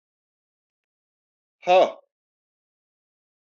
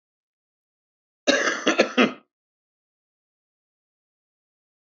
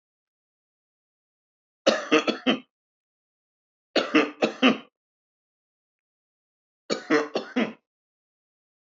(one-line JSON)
{"exhalation_length": "3.5 s", "exhalation_amplitude": 15598, "exhalation_signal_mean_std_ratio": 0.2, "cough_length": "4.9 s", "cough_amplitude": 25843, "cough_signal_mean_std_ratio": 0.27, "three_cough_length": "8.9 s", "three_cough_amplitude": 19903, "three_cough_signal_mean_std_ratio": 0.3, "survey_phase": "beta (2021-08-13 to 2022-03-07)", "age": "45-64", "gender": "Male", "wearing_mask": "No", "symptom_cough_any": true, "symptom_onset": "10 days", "smoker_status": "Ex-smoker", "respiratory_condition_asthma": false, "respiratory_condition_other": false, "recruitment_source": "REACT", "submission_delay": "3 days", "covid_test_result": "Negative", "covid_test_method": "RT-qPCR", "influenza_a_test_result": "Negative", "influenza_b_test_result": "Negative"}